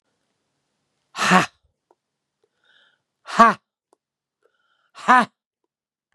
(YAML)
exhalation_length: 6.1 s
exhalation_amplitude: 32767
exhalation_signal_mean_std_ratio: 0.23
survey_phase: beta (2021-08-13 to 2022-03-07)
age: 65+
gender: Female
wearing_mask: 'No'
symptom_none: true
smoker_status: Ex-smoker
respiratory_condition_asthma: false
respiratory_condition_other: false
recruitment_source: REACT
submission_delay: 3 days
covid_test_result: Negative
covid_test_method: RT-qPCR
influenza_a_test_result: Negative
influenza_b_test_result: Negative